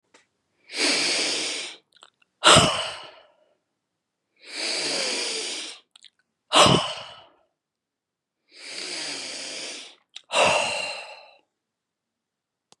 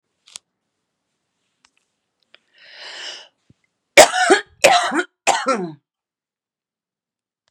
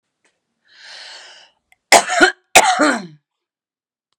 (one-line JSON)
{"exhalation_length": "12.8 s", "exhalation_amplitude": 29749, "exhalation_signal_mean_std_ratio": 0.4, "three_cough_length": "7.5 s", "three_cough_amplitude": 32768, "three_cough_signal_mean_std_ratio": 0.27, "cough_length": "4.2 s", "cough_amplitude": 32768, "cough_signal_mean_std_ratio": 0.32, "survey_phase": "beta (2021-08-13 to 2022-03-07)", "age": "65+", "gender": "Female", "wearing_mask": "No", "symptom_none": true, "smoker_status": "Ex-smoker", "respiratory_condition_asthma": false, "respiratory_condition_other": false, "recruitment_source": "REACT", "submission_delay": "2 days", "covid_test_result": "Negative", "covid_test_method": "RT-qPCR", "influenza_a_test_result": "Negative", "influenza_b_test_result": "Negative"}